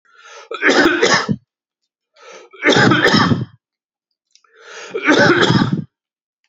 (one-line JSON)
{"three_cough_length": "6.5 s", "three_cough_amplitude": 32104, "three_cough_signal_mean_std_ratio": 0.52, "survey_phase": "beta (2021-08-13 to 2022-03-07)", "age": "45-64", "gender": "Male", "wearing_mask": "No", "symptom_fatigue": true, "smoker_status": "Never smoked", "respiratory_condition_asthma": false, "respiratory_condition_other": false, "recruitment_source": "REACT", "submission_delay": "2 days", "covid_test_result": "Negative", "covid_test_method": "RT-qPCR", "influenza_a_test_result": "Negative", "influenza_b_test_result": "Negative"}